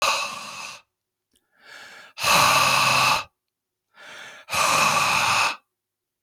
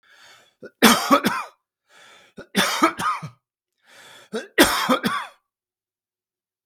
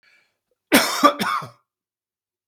{"exhalation_length": "6.2 s", "exhalation_amplitude": 17828, "exhalation_signal_mean_std_ratio": 0.57, "three_cough_length": "6.7 s", "three_cough_amplitude": 32767, "three_cough_signal_mean_std_ratio": 0.38, "cough_length": "2.5 s", "cough_amplitude": 32766, "cough_signal_mean_std_ratio": 0.35, "survey_phase": "beta (2021-08-13 to 2022-03-07)", "age": "65+", "gender": "Male", "wearing_mask": "No", "symptom_none": true, "symptom_onset": "12 days", "smoker_status": "Never smoked", "respiratory_condition_asthma": false, "respiratory_condition_other": false, "recruitment_source": "REACT", "submission_delay": "2 days", "covid_test_result": "Negative", "covid_test_method": "RT-qPCR", "influenza_a_test_result": "Negative", "influenza_b_test_result": "Negative"}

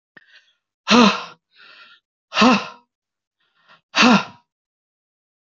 {"exhalation_length": "5.5 s", "exhalation_amplitude": 27922, "exhalation_signal_mean_std_ratio": 0.32, "survey_phase": "alpha (2021-03-01 to 2021-08-12)", "age": "18-44", "gender": "Male", "wearing_mask": "No", "symptom_none": true, "smoker_status": "Never smoked", "respiratory_condition_asthma": false, "respiratory_condition_other": false, "recruitment_source": "REACT", "submission_delay": "1 day", "covid_test_result": "Negative", "covid_test_method": "RT-qPCR"}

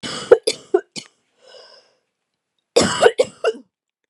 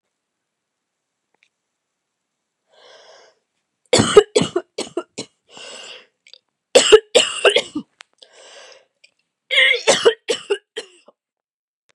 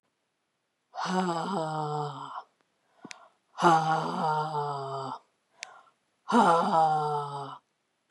{"cough_length": "4.1 s", "cough_amplitude": 32768, "cough_signal_mean_std_ratio": 0.31, "three_cough_length": "11.9 s", "three_cough_amplitude": 32768, "three_cough_signal_mean_std_ratio": 0.29, "exhalation_length": "8.1 s", "exhalation_amplitude": 12785, "exhalation_signal_mean_std_ratio": 0.55, "survey_phase": "beta (2021-08-13 to 2022-03-07)", "age": "45-64", "gender": "Female", "wearing_mask": "No", "symptom_cough_any": true, "symptom_runny_or_blocked_nose": true, "symptom_fever_high_temperature": true, "symptom_headache": true, "symptom_change_to_sense_of_smell_or_taste": true, "symptom_onset": "2 days", "smoker_status": "Never smoked", "respiratory_condition_asthma": false, "respiratory_condition_other": false, "recruitment_source": "Test and Trace", "submission_delay": "1 day", "covid_test_result": "Positive", "covid_test_method": "RT-qPCR", "covid_ct_value": 19.0, "covid_ct_gene": "ORF1ab gene", "covid_ct_mean": 19.6, "covid_viral_load": "360000 copies/ml", "covid_viral_load_category": "Low viral load (10K-1M copies/ml)"}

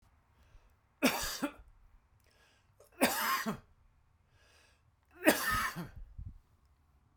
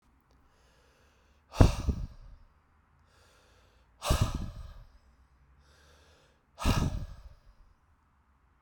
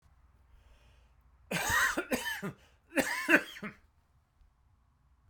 {"three_cough_length": "7.2 s", "three_cough_amplitude": 11586, "three_cough_signal_mean_std_ratio": 0.37, "exhalation_length": "8.6 s", "exhalation_amplitude": 27470, "exhalation_signal_mean_std_ratio": 0.28, "cough_length": "5.3 s", "cough_amplitude": 10312, "cough_signal_mean_std_ratio": 0.39, "survey_phase": "alpha (2021-03-01 to 2021-08-12)", "age": "45-64", "gender": "Male", "wearing_mask": "No", "symptom_cough_any": true, "symptom_headache": true, "symptom_onset": "4 days", "smoker_status": "Never smoked", "respiratory_condition_asthma": false, "respiratory_condition_other": false, "recruitment_source": "Test and Trace", "submission_delay": "0 days", "covid_test_result": "Positive", "covid_test_method": "LAMP"}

